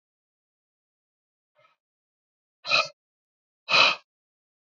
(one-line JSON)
{"exhalation_length": "4.7 s", "exhalation_amplitude": 17961, "exhalation_signal_mean_std_ratio": 0.23, "survey_phase": "beta (2021-08-13 to 2022-03-07)", "age": "45-64", "gender": "Male", "wearing_mask": "Yes", "symptom_cough_any": true, "symptom_runny_or_blocked_nose": true, "symptom_onset": "5 days", "smoker_status": "Current smoker (11 or more cigarettes per day)", "respiratory_condition_asthma": false, "respiratory_condition_other": false, "recruitment_source": "Test and Trace", "submission_delay": "4 days", "covid_test_result": "Positive", "covid_test_method": "LAMP"}